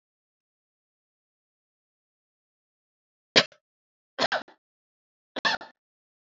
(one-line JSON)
{"three_cough_length": "6.2 s", "three_cough_amplitude": 21564, "three_cough_signal_mean_std_ratio": 0.17, "survey_phase": "alpha (2021-03-01 to 2021-08-12)", "age": "45-64", "gender": "Female", "wearing_mask": "No", "symptom_none": true, "smoker_status": "Never smoked", "respiratory_condition_asthma": false, "respiratory_condition_other": false, "recruitment_source": "REACT", "submission_delay": "1 day", "covid_test_result": "Negative", "covid_test_method": "RT-qPCR"}